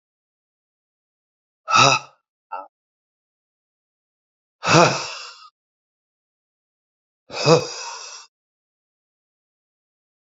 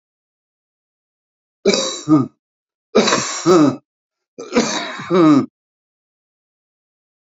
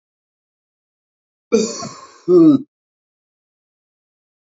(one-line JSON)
{"exhalation_length": "10.3 s", "exhalation_amplitude": 30003, "exhalation_signal_mean_std_ratio": 0.25, "three_cough_length": "7.3 s", "three_cough_amplitude": 32141, "three_cough_signal_mean_std_ratio": 0.41, "cough_length": "4.5 s", "cough_amplitude": 26066, "cough_signal_mean_std_ratio": 0.28, "survey_phase": "beta (2021-08-13 to 2022-03-07)", "age": "45-64", "gender": "Male", "wearing_mask": "No", "symptom_none": true, "smoker_status": "Current smoker (11 or more cigarettes per day)", "respiratory_condition_asthma": false, "respiratory_condition_other": true, "recruitment_source": "REACT", "submission_delay": "1 day", "covid_test_result": "Negative", "covid_test_method": "RT-qPCR", "influenza_a_test_result": "Negative", "influenza_b_test_result": "Negative"}